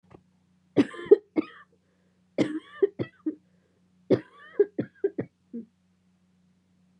{"three_cough_length": "7.0 s", "three_cough_amplitude": 20621, "three_cough_signal_mean_std_ratio": 0.25, "survey_phase": "beta (2021-08-13 to 2022-03-07)", "age": "18-44", "gender": "Female", "wearing_mask": "No", "symptom_cough_any": true, "symptom_new_continuous_cough": true, "symptom_runny_or_blocked_nose": true, "symptom_sore_throat": true, "symptom_fatigue": true, "symptom_fever_high_temperature": true, "symptom_headache": true, "symptom_onset": "4 days", "smoker_status": "Never smoked", "respiratory_condition_asthma": false, "respiratory_condition_other": false, "recruitment_source": "Test and Trace", "submission_delay": "1 day", "covid_test_result": "Positive", "covid_test_method": "ePCR"}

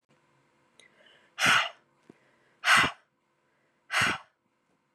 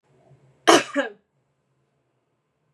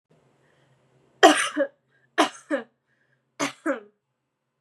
{"exhalation_length": "4.9 s", "exhalation_amplitude": 12750, "exhalation_signal_mean_std_ratio": 0.32, "cough_length": "2.7 s", "cough_amplitude": 31872, "cough_signal_mean_std_ratio": 0.23, "three_cough_length": "4.6 s", "three_cough_amplitude": 31421, "three_cough_signal_mean_std_ratio": 0.28, "survey_phase": "beta (2021-08-13 to 2022-03-07)", "age": "18-44", "gender": "Female", "wearing_mask": "No", "symptom_none": true, "smoker_status": "Never smoked", "respiratory_condition_asthma": false, "respiratory_condition_other": false, "recruitment_source": "REACT", "submission_delay": "1 day", "covid_test_result": "Negative", "covid_test_method": "RT-qPCR", "influenza_a_test_result": "Negative", "influenza_b_test_result": "Negative"}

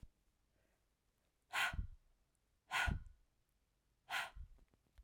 {"exhalation_length": "5.0 s", "exhalation_amplitude": 2156, "exhalation_signal_mean_std_ratio": 0.35, "survey_phase": "alpha (2021-03-01 to 2021-08-12)", "age": "18-44", "gender": "Female", "wearing_mask": "No", "symptom_cough_any": true, "symptom_fatigue": true, "symptom_headache": true, "symptom_change_to_sense_of_smell_or_taste": true, "smoker_status": "Never smoked", "respiratory_condition_asthma": false, "respiratory_condition_other": false, "recruitment_source": "Test and Trace", "submission_delay": "2 days", "covid_test_result": "Positive", "covid_test_method": "RT-qPCR", "covid_ct_value": 15.4, "covid_ct_gene": "ORF1ab gene", "covid_ct_mean": 15.9, "covid_viral_load": "6200000 copies/ml", "covid_viral_load_category": "High viral load (>1M copies/ml)"}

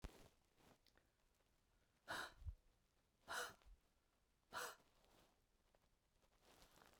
{"exhalation_length": "7.0 s", "exhalation_amplitude": 463, "exhalation_signal_mean_std_ratio": 0.37, "survey_phase": "beta (2021-08-13 to 2022-03-07)", "age": "45-64", "gender": "Female", "wearing_mask": "No", "symptom_new_continuous_cough": true, "symptom_sore_throat": true, "symptom_onset": "3 days", "smoker_status": "Never smoked", "respiratory_condition_asthma": false, "respiratory_condition_other": false, "recruitment_source": "Test and Trace", "submission_delay": "1 day", "covid_test_result": "Positive", "covid_test_method": "RT-qPCR", "covid_ct_value": 34.2, "covid_ct_gene": "ORF1ab gene"}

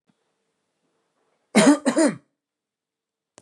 {"cough_length": "3.4 s", "cough_amplitude": 25260, "cough_signal_mean_std_ratio": 0.29, "survey_phase": "beta (2021-08-13 to 2022-03-07)", "age": "45-64", "gender": "Male", "wearing_mask": "No", "symptom_none": true, "smoker_status": "Never smoked", "respiratory_condition_asthma": false, "respiratory_condition_other": false, "recruitment_source": "REACT", "submission_delay": "1 day", "covid_test_result": "Negative", "covid_test_method": "RT-qPCR", "influenza_a_test_result": "Negative", "influenza_b_test_result": "Negative"}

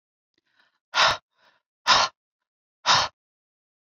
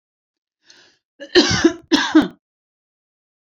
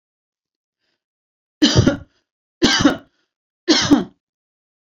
{"exhalation_length": "3.9 s", "exhalation_amplitude": 18170, "exhalation_signal_mean_std_ratio": 0.31, "cough_length": "3.4 s", "cough_amplitude": 29877, "cough_signal_mean_std_ratio": 0.34, "three_cough_length": "4.9 s", "three_cough_amplitude": 31288, "three_cough_signal_mean_std_ratio": 0.35, "survey_phase": "beta (2021-08-13 to 2022-03-07)", "age": "45-64", "gender": "Female", "wearing_mask": "No", "symptom_none": true, "smoker_status": "Ex-smoker", "respiratory_condition_asthma": false, "respiratory_condition_other": false, "recruitment_source": "Test and Trace", "submission_delay": "1 day", "covid_test_result": "Negative", "covid_test_method": "RT-qPCR"}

